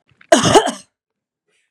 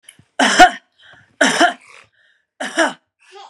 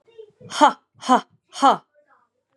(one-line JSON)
{"cough_length": "1.7 s", "cough_amplitude": 32768, "cough_signal_mean_std_ratio": 0.35, "three_cough_length": "3.5 s", "three_cough_amplitude": 32768, "three_cough_signal_mean_std_ratio": 0.37, "exhalation_length": "2.6 s", "exhalation_amplitude": 31364, "exhalation_signal_mean_std_ratio": 0.31, "survey_phase": "beta (2021-08-13 to 2022-03-07)", "age": "18-44", "gender": "Female", "wearing_mask": "No", "symptom_runny_or_blocked_nose": true, "symptom_sore_throat": true, "symptom_onset": "2 days", "smoker_status": "Never smoked", "respiratory_condition_asthma": false, "respiratory_condition_other": false, "recruitment_source": "Test and Trace", "submission_delay": "0 days", "covid_test_result": "Positive", "covid_test_method": "RT-qPCR", "covid_ct_value": 19.0, "covid_ct_gene": "ORF1ab gene", "covid_ct_mean": 19.6, "covid_viral_load": "370000 copies/ml", "covid_viral_load_category": "Low viral load (10K-1M copies/ml)"}